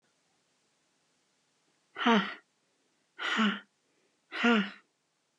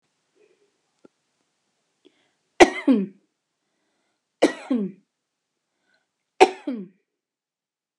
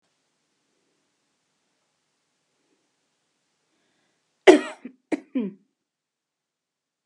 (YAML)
exhalation_length: 5.4 s
exhalation_amplitude: 10060
exhalation_signal_mean_std_ratio: 0.33
three_cough_length: 8.0 s
three_cough_amplitude: 32768
three_cough_signal_mean_std_ratio: 0.21
cough_length: 7.1 s
cough_amplitude: 32681
cough_signal_mean_std_ratio: 0.14
survey_phase: alpha (2021-03-01 to 2021-08-12)
age: 45-64
gender: Female
wearing_mask: 'No'
symptom_none: true
smoker_status: Ex-smoker
respiratory_condition_asthma: false
respiratory_condition_other: false
recruitment_source: REACT
submission_delay: 0 days
covid_test_result: Negative
covid_test_method: RT-qPCR